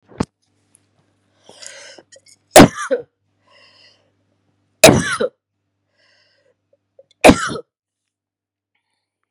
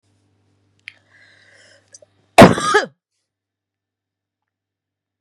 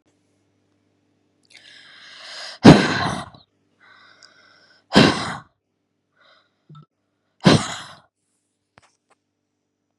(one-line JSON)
{"three_cough_length": "9.3 s", "three_cough_amplitude": 32768, "three_cough_signal_mean_std_ratio": 0.21, "cough_length": "5.2 s", "cough_amplitude": 32768, "cough_signal_mean_std_ratio": 0.19, "exhalation_length": "10.0 s", "exhalation_amplitude": 32768, "exhalation_signal_mean_std_ratio": 0.23, "survey_phase": "beta (2021-08-13 to 2022-03-07)", "age": "45-64", "gender": "Female", "wearing_mask": "No", "symptom_cough_any": true, "symptom_fatigue": true, "symptom_onset": "3 days", "smoker_status": "Never smoked", "respiratory_condition_asthma": false, "respiratory_condition_other": false, "recruitment_source": "Test and Trace", "submission_delay": "2 days", "covid_test_result": "Positive", "covid_test_method": "RT-qPCR", "covid_ct_value": 12.8, "covid_ct_gene": "ORF1ab gene"}